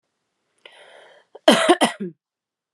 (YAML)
cough_length: 2.7 s
cough_amplitude: 32532
cough_signal_mean_std_ratio: 0.3
survey_phase: beta (2021-08-13 to 2022-03-07)
age: 18-44
gender: Female
wearing_mask: 'Yes'
symptom_cough_any: true
symptom_runny_or_blocked_nose: true
symptom_diarrhoea: true
symptom_headache: true
symptom_change_to_sense_of_smell_or_taste: true
smoker_status: Never smoked
respiratory_condition_asthma: false
respiratory_condition_other: false
recruitment_source: Test and Trace
submission_delay: 1 day
covid_test_result: Positive
covid_test_method: RT-qPCR